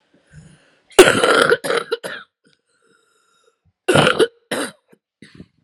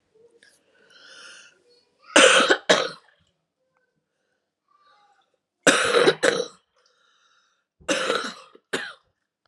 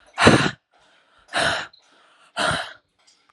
{
  "cough_length": "5.6 s",
  "cough_amplitude": 32768,
  "cough_signal_mean_std_ratio": 0.36,
  "three_cough_length": "9.5 s",
  "three_cough_amplitude": 32378,
  "three_cough_signal_mean_std_ratio": 0.32,
  "exhalation_length": "3.3 s",
  "exhalation_amplitude": 32768,
  "exhalation_signal_mean_std_ratio": 0.38,
  "survey_phase": "alpha (2021-03-01 to 2021-08-12)",
  "age": "18-44",
  "gender": "Female",
  "wearing_mask": "No",
  "symptom_cough_any": true,
  "symptom_new_continuous_cough": true,
  "symptom_shortness_of_breath": true,
  "symptom_fatigue": true,
  "symptom_onset": "3 days",
  "smoker_status": "Ex-smoker",
  "respiratory_condition_asthma": false,
  "respiratory_condition_other": false,
  "recruitment_source": "Test and Trace",
  "submission_delay": "2 days",
  "covid_test_result": "Positive",
  "covid_test_method": "RT-qPCR",
  "covid_ct_value": 20.8,
  "covid_ct_gene": "ORF1ab gene",
  "covid_ct_mean": 21.0,
  "covid_viral_load": "130000 copies/ml",
  "covid_viral_load_category": "Low viral load (10K-1M copies/ml)"
}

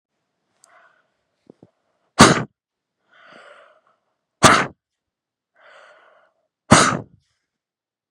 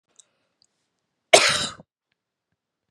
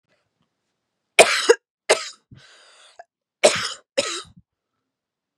{
  "exhalation_length": "8.1 s",
  "exhalation_amplitude": 32768,
  "exhalation_signal_mean_std_ratio": 0.22,
  "cough_length": "2.9 s",
  "cough_amplitude": 32768,
  "cough_signal_mean_std_ratio": 0.22,
  "three_cough_length": "5.4 s",
  "three_cough_amplitude": 32768,
  "three_cough_signal_mean_std_ratio": 0.26,
  "survey_phase": "beta (2021-08-13 to 2022-03-07)",
  "age": "18-44",
  "gender": "Female",
  "wearing_mask": "No",
  "symptom_fatigue": true,
  "symptom_headache": true,
  "smoker_status": "Ex-smoker",
  "respiratory_condition_asthma": false,
  "respiratory_condition_other": false,
  "recruitment_source": "REACT",
  "submission_delay": "1 day",
  "covid_test_result": "Negative",
  "covid_test_method": "RT-qPCR",
  "influenza_a_test_result": "Negative",
  "influenza_b_test_result": "Negative"
}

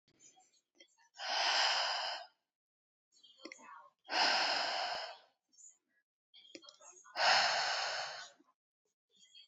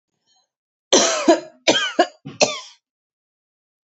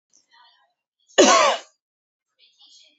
{
  "exhalation_length": "9.5 s",
  "exhalation_amplitude": 4433,
  "exhalation_signal_mean_std_ratio": 0.48,
  "three_cough_length": "3.8 s",
  "three_cough_amplitude": 31172,
  "three_cough_signal_mean_std_ratio": 0.37,
  "cough_length": "3.0 s",
  "cough_amplitude": 27107,
  "cough_signal_mean_std_ratio": 0.29,
  "survey_phase": "beta (2021-08-13 to 2022-03-07)",
  "age": "18-44",
  "gender": "Female",
  "wearing_mask": "No",
  "symptom_none": true,
  "smoker_status": "Never smoked",
  "respiratory_condition_asthma": false,
  "respiratory_condition_other": false,
  "recruitment_source": "REACT",
  "submission_delay": "1 day",
  "covid_test_result": "Negative",
  "covid_test_method": "RT-qPCR"
}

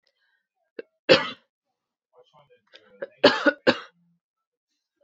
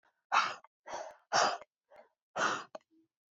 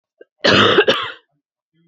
{
  "three_cough_length": "5.0 s",
  "three_cough_amplitude": 27302,
  "three_cough_signal_mean_std_ratio": 0.23,
  "exhalation_length": "3.3 s",
  "exhalation_amplitude": 6147,
  "exhalation_signal_mean_std_ratio": 0.39,
  "cough_length": "1.9 s",
  "cough_amplitude": 29660,
  "cough_signal_mean_std_ratio": 0.46,
  "survey_phase": "beta (2021-08-13 to 2022-03-07)",
  "age": "18-44",
  "gender": "Female",
  "wearing_mask": "No",
  "symptom_cough_any": true,
  "symptom_runny_or_blocked_nose": true,
  "symptom_fatigue": true,
  "symptom_fever_high_temperature": true,
  "symptom_headache": true,
  "symptom_onset": "5 days",
  "smoker_status": "Ex-smoker",
  "respiratory_condition_asthma": false,
  "respiratory_condition_other": false,
  "recruitment_source": "Test and Trace",
  "submission_delay": "2 days",
  "covid_test_result": "Positive",
  "covid_test_method": "RT-qPCR",
  "covid_ct_value": 17.3,
  "covid_ct_gene": "ORF1ab gene"
}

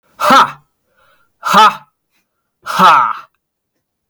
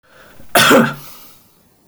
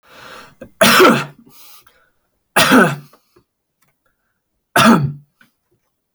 {
  "exhalation_length": "4.1 s",
  "exhalation_amplitude": 32768,
  "exhalation_signal_mean_std_ratio": 0.42,
  "cough_length": "1.9 s",
  "cough_amplitude": 32768,
  "cough_signal_mean_std_ratio": 0.41,
  "three_cough_length": "6.1 s",
  "three_cough_amplitude": 32768,
  "three_cough_signal_mean_std_ratio": 0.37,
  "survey_phase": "beta (2021-08-13 to 2022-03-07)",
  "age": "18-44",
  "gender": "Male",
  "wearing_mask": "No",
  "symptom_none": true,
  "smoker_status": "Never smoked",
  "respiratory_condition_asthma": false,
  "respiratory_condition_other": false,
  "recruitment_source": "REACT",
  "submission_delay": "3 days",
  "covid_test_result": "Negative",
  "covid_test_method": "RT-qPCR",
  "influenza_a_test_result": "Negative",
  "influenza_b_test_result": "Negative"
}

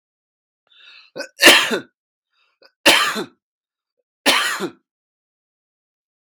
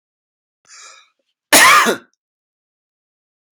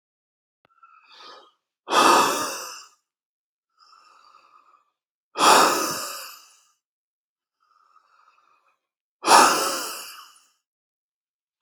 {
  "three_cough_length": "6.2 s",
  "three_cough_amplitude": 32768,
  "three_cough_signal_mean_std_ratio": 0.31,
  "cough_length": "3.5 s",
  "cough_amplitude": 32768,
  "cough_signal_mean_std_ratio": 0.29,
  "exhalation_length": "11.6 s",
  "exhalation_amplitude": 32595,
  "exhalation_signal_mean_std_ratio": 0.31,
  "survey_phase": "beta (2021-08-13 to 2022-03-07)",
  "age": "18-44",
  "gender": "Male",
  "wearing_mask": "No",
  "symptom_none": true,
  "smoker_status": "Never smoked",
  "respiratory_condition_asthma": true,
  "respiratory_condition_other": false,
  "recruitment_source": "REACT",
  "submission_delay": "2 days",
  "covid_test_result": "Negative",
  "covid_test_method": "RT-qPCR"
}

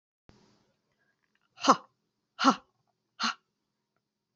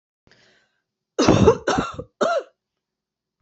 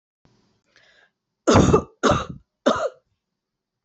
{
  "exhalation_length": "4.4 s",
  "exhalation_amplitude": 16078,
  "exhalation_signal_mean_std_ratio": 0.21,
  "cough_length": "3.4 s",
  "cough_amplitude": 27617,
  "cough_signal_mean_std_ratio": 0.38,
  "three_cough_length": "3.8 s",
  "three_cough_amplitude": 27855,
  "three_cough_signal_mean_std_ratio": 0.35,
  "survey_phase": "alpha (2021-03-01 to 2021-08-12)",
  "age": "45-64",
  "gender": "Female",
  "wearing_mask": "No",
  "symptom_cough_any": true,
  "symptom_onset": "3 days",
  "smoker_status": "Never smoked",
  "respiratory_condition_asthma": false,
  "respiratory_condition_other": false,
  "recruitment_source": "Test and Trace",
  "submission_delay": "2 days",
  "covid_test_result": "Positive",
  "covid_test_method": "RT-qPCR",
  "covid_ct_value": 29.6,
  "covid_ct_gene": "ORF1ab gene",
  "covid_ct_mean": 30.3,
  "covid_viral_load": "120 copies/ml",
  "covid_viral_load_category": "Minimal viral load (< 10K copies/ml)"
}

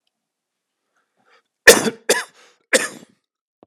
{
  "three_cough_length": "3.7 s",
  "three_cough_amplitude": 32768,
  "three_cough_signal_mean_std_ratio": 0.23,
  "survey_phase": "alpha (2021-03-01 to 2021-08-12)",
  "age": "45-64",
  "gender": "Male",
  "wearing_mask": "Yes",
  "symptom_cough_any": true,
  "symptom_shortness_of_breath": true,
  "symptom_fatigue": true,
  "symptom_headache": true,
  "symptom_onset": "3 days",
  "smoker_status": "Ex-smoker",
  "respiratory_condition_asthma": false,
  "respiratory_condition_other": true,
  "recruitment_source": "Test and Trace",
  "submission_delay": "2 days",
  "covid_test_result": "Positive",
  "covid_test_method": "RT-qPCR",
  "covid_ct_value": 17.1,
  "covid_ct_gene": "ORF1ab gene",
  "covid_ct_mean": 17.3,
  "covid_viral_load": "2100000 copies/ml",
  "covid_viral_load_category": "High viral load (>1M copies/ml)"
}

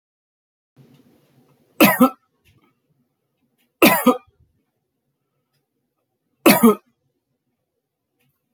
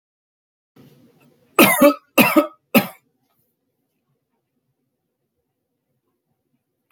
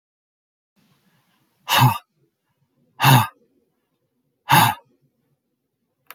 {
  "three_cough_length": "8.5 s",
  "three_cough_amplitude": 32767,
  "three_cough_signal_mean_std_ratio": 0.24,
  "cough_length": "6.9 s",
  "cough_amplitude": 32768,
  "cough_signal_mean_std_ratio": 0.24,
  "exhalation_length": "6.1 s",
  "exhalation_amplitude": 29403,
  "exhalation_signal_mean_std_ratio": 0.28,
  "survey_phase": "beta (2021-08-13 to 2022-03-07)",
  "age": "45-64",
  "gender": "Male",
  "wearing_mask": "No",
  "symptom_none": true,
  "smoker_status": "Never smoked",
  "respiratory_condition_asthma": false,
  "respiratory_condition_other": false,
  "recruitment_source": "REACT",
  "submission_delay": "5 days",
  "covid_test_result": "Negative",
  "covid_test_method": "RT-qPCR"
}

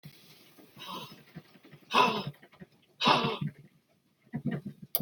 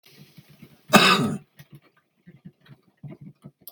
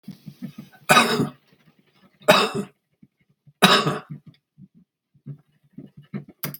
{
  "exhalation_length": "5.0 s",
  "exhalation_amplitude": 15553,
  "exhalation_signal_mean_std_ratio": 0.39,
  "cough_length": "3.7 s",
  "cough_amplitude": 32768,
  "cough_signal_mean_std_ratio": 0.28,
  "three_cough_length": "6.6 s",
  "three_cough_amplitude": 32768,
  "three_cough_signal_mean_std_ratio": 0.33,
  "survey_phase": "beta (2021-08-13 to 2022-03-07)",
  "age": "65+",
  "gender": "Male",
  "wearing_mask": "No",
  "symptom_none": true,
  "smoker_status": "Ex-smoker",
  "respiratory_condition_asthma": false,
  "respiratory_condition_other": true,
  "recruitment_source": "REACT",
  "submission_delay": "1 day",
  "covid_test_result": "Negative",
  "covid_test_method": "RT-qPCR"
}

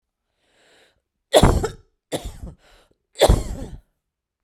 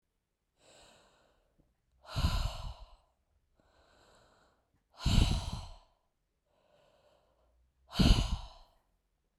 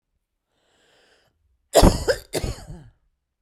{
  "three_cough_length": "4.4 s",
  "three_cough_amplitude": 32768,
  "three_cough_signal_mean_std_ratio": 0.31,
  "exhalation_length": "9.4 s",
  "exhalation_amplitude": 9807,
  "exhalation_signal_mean_std_ratio": 0.29,
  "cough_length": "3.4 s",
  "cough_amplitude": 29929,
  "cough_signal_mean_std_ratio": 0.27,
  "survey_phase": "beta (2021-08-13 to 2022-03-07)",
  "age": "45-64",
  "gender": "Female",
  "wearing_mask": "No",
  "symptom_none": true,
  "smoker_status": "Ex-smoker",
  "respiratory_condition_asthma": false,
  "respiratory_condition_other": false,
  "recruitment_source": "REACT",
  "submission_delay": "0 days",
  "covid_test_result": "Negative",
  "covid_test_method": "RT-qPCR"
}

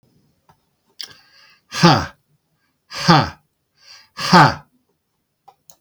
{
  "exhalation_length": "5.8 s",
  "exhalation_amplitude": 32768,
  "exhalation_signal_mean_std_ratio": 0.29,
  "survey_phase": "beta (2021-08-13 to 2022-03-07)",
  "age": "65+",
  "gender": "Male",
  "wearing_mask": "No",
  "symptom_none": true,
  "smoker_status": "Never smoked",
  "respiratory_condition_asthma": false,
  "respiratory_condition_other": false,
  "recruitment_source": "REACT",
  "submission_delay": "1 day",
  "covid_test_result": "Negative",
  "covid_test_method": "RT-qPCR",
  "influenza_a_test_result": "Negative",
  "influenza_b_test_result": "Negative"
}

